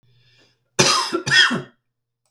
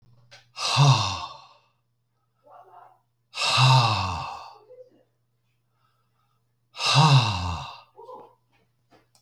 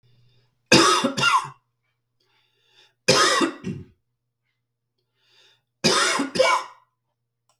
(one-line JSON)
{"cough_length": "2.3 s", "cough_amplitude": 32768, "cough_signal_mean_std_ratio": 0.45, "exhalation_length": "9.2 s", "exhalation_amplitude": 18559, "exhalation_signal_mean_std_ratio": 0.4, "three_cough_length": "7.6 s", "three_cough_amplitude": 32766, "three_cough_signal_mean_std_ratio": 0.4, "survey_phase": "beta (2021-08-13 to 2022-03-07)", "age": "65+", "gender": "Male", "wearing_mask": "No", "symptom_none": true, "smoker_status": "Never smoked", "respiratory_condition_asthma": false, "respiratory_condition_other": false, "recruitment_source": "REACT", "submission_delay": "5 days", "covid_test_result": "Negative", "covid_test_method": "RT-qPCR", "influenza_a_test_result": "Negative", "influenza_b_test_result": "Negative"}